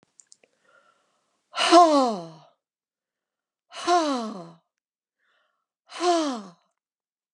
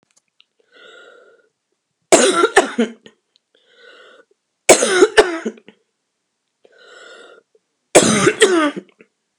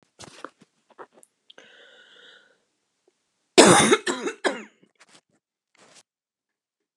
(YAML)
exhalation_length: 7.3 s
exhalation_amplitude: 23689
exhalation_signal_mean_std_ratio: 0.32
three_cough_length: 9.4 s
three_cough_amplitude: 32768
three_cough_signal_mean_std_ratio: 0.35
cough_length: 7.0 s
cough_amplitude: 32767
cough_signal_mean_std_ratio: 0.23
survey_phase: beta (2021-08-13 to 2022-03-07)
age: 65+
gender: Female
wearing_mask: 'No'
symptom_none: true
smoker_status: Never smoked
respiratory_condition_asthma: true
respiratory_condition_other: false
recruitment_source: REACT
submission_delay: 0 days
covid_test_result: Negative
covid_test_method: RT-qPCR